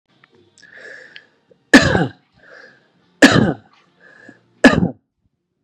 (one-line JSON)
{"three_cough_length": "5.6 s", "three_cough_amplitude": 32768, "three_cough_signal_mean_std_ratio": 0.29, "survey_phase": "beta (2021-08-13 to 2022-03-07)", "age": "18-44", "gender": "Male", "wearing_mask": "No", "symptom_none": true, "smoker_status": "Ex-smoker", "respiratory_condition_asthma": false, "respiratory_condition_other": false, "recruitment_source": "REACT", "submission_delay": "3 days", "covid_test_result": "Negative", "covid_test_method": "RT-qPCR"}